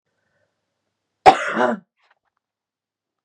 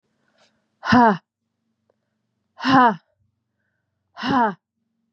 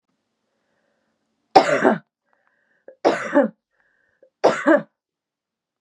{"cough_length": "3.2 s", "cough_amplitude": 32768, "cough_signal_mean_std_ratio": 0.23, "exhalation_length": "5.1 s", "exhalation_amplitude": 28405, "exhalation_signal_mean_std_ratio": 0.33, "three_cough_length": "5.8 s", "three_cough_amplitude": 32768, "three_cough_signal_mean_std_ratio": 0.31, "survey_phase": "beta (2021-08-13 to 2022-03-07)", "age": "18-44", "gender": "Female", "wearing_mask": "No", "symptom_runny_or_blocked_nose": true, "symptom_sore_throat": true, "symptom_headache": true, "symptom_onset": "3 days", "smoker_status": "Never smoked", "respiratory_condition_asthma": true, "respiratory_condition_other": false, "recruitment_source": "Test and Trace", "submission_delay": "1 day", "covid_test_result": "Positive", "covid_test_method": "RT-qPCR", "covid_ct_value": 14.9, "covid_ct_gene": "ORF1ab gene", "covid_ct_mean": 15.2, "covid_viral_load": "10000000 copies/ml", "covid_viral_load_category": "High viral load (>1M copies/ml)"}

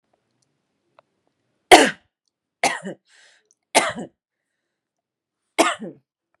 {"three_cough_length": "6.4 s", "three_cough_amplitude": 32768, "three_cough_signal_mean_std_ratio": 0.22, "survey_phase": "beta (2021-08-13 to 2022-03-07)", "age": "45-64", "gender": "Female", "wearing_mask": "Yes", "symptom_shortness_of_breath": true, "symptom_headache": true, "symptom_onset": "9 days", "smoker_status": "Ex-smoker", "respiratory_condition_asthma": true, "respiratory_condition_other": false, "recruitment_source": "REACT", "submission_delay": "2 days", "covid_test_result": "Negative", "covid_test_method": "RT-qPCR", "influenza_a_test_result": "Unknown/Void", "influenza_b_test_result": "Unknown/Void"}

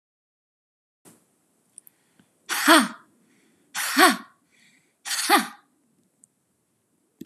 {"exhalation_length": "7.3 s", "exhalation_amplitude": 29948, "exhalation_signal_mean_std_ratio": 0.28, "survey_phase": "beta (2021-08-13 to 2022-03-07)", "age": "18-44", "gender": "Female", "wearing_mask": "No", "symptom_none": true, "symptom_onset": "7 days", "smoker_status": "Never smoked", "respiratory_condition_asthma": false, "respiratory_condition_other": false, "recruitment_source": "Test and Trace", "submission_delay": "2 days", "covid_test_result": "Positive", "covid_test_method": "RT-qPCR", "covid_ct_value": 28.1, "covid_ct_gene": "ORF1ab gene", "covid_ct_mean": 29.3, "covid_viral_load": "240 copies/ml", "covid_viral_load_category": "Minimal viral load (< 10K copies/ml)"}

